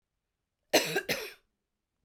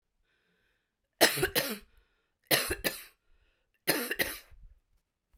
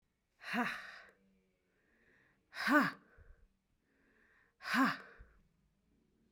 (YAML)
cough_length: 2.0 s
cough_amplitude: 10390
cough_signal_mean_std_ratio: 0.32
three_cough_length: 5.4 s
three_cough_amplitude: 12383
three_cough_signal_mean_std_ratio: 0.34
exhalation_length: 6.3 s
exhalation_amplitude: 4935
exhalation_signal_mean_std_ratio: 0.31
survey_phase: beta (2021-08-13 to 2022-03-07)
age: 45-64
gender: Female
wearing_mask: 'No'
symptom_none: true
smoker_status: Never smoked
respiratory_condition_asthma: false
respiratory_condition_other: false
recruitment_source: REACT
submission_delay: 3 days
covid_test_result: Negative
covid_test_method: RT-qPCR
influenza_a_test_result: Negative
influenza_b_test_result: Negative